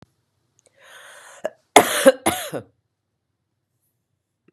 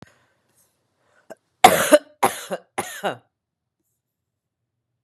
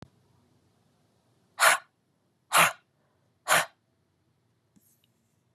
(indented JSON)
{
  "cough_length": "4.5 s",
  "cough_amplitude": 32768,
  "cough_signal_mean_std_ratio": 0.23,
  "three_cough_length": "5.0 s",
  "three_cough_amplitude": 32768,
  "three_cough_signal_mean_std_ratio": 0.23,
  "exhalation_length": "5.5 s",
  "exhalation_amplitude": 17209,
  "exhalation_signal_mean_std_ratio": 0.24,
  "survey_phase": "beta (2021-08-13 to 2022-03-07)",
  "age": "45-64",
  "gender": "Female",
  "wearing_mask": "No",
  "symptom_none": true,
  "smoker_status": "Ex-smoker",
  "respiratory_condition_asthma": false,
  "respiratory_condition_other": false,
  "recruitment_source": "REACT",
  "submission_delay": "3 days",
  "covid_test_result": "Negative",
  "covid_test_method": "RT-qPCR",
  "influenza_a_test_result": "Negative",
  "influenza_b_test_result": "Negative"
}